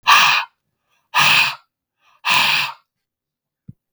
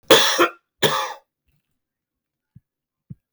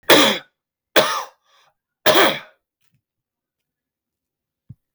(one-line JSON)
{"exhalation_length": "3.9 s", "exhalation_amplitude": 32768, "exhalation_signal_mean_std_ratio": 0.46, "cough_length": "3.3 s", "cough_amplitude": 32768, "cough_signal_mean_std_ratio": 0.32, "three_cough_length": "4.9 s", "three_cough_amplitude": 32768, "three_cough_signal_mean_std_ratio": 0.32, "survey_phase": "beta (2021-08-13 to 2022-03-07)", "age": "45-64", "gender": "Male", "wearing_mask": "No", "symptom_cough_any": true, "symptom_new_continuous_cough": true, "symptom_runny_or_blocked_nose": true, "symptom_fatigue": true, "symptom_headache": true, "symptom_change_to_sense_of_smell_or_taste": true, "symptom_onset": "3 days", "smoker_status": "Never smoked", "respiratory_condition_asthma": false, "respiratory_condition_other": false, "recruitment_source": "Test and Trace", "submission_delay": "1 day", "covid_test_result": "Positive", "covid_test_method": "RT-qPCR", "covid_ct_value": 26.8, "covid_ct_gene": "ORF1ab gene", "covid_ct_mean": 27.5, "covid_viral_load": "930 copies/ml", "covid_viral_load_category": "Minimal viral load (< 10K copies/ml)"}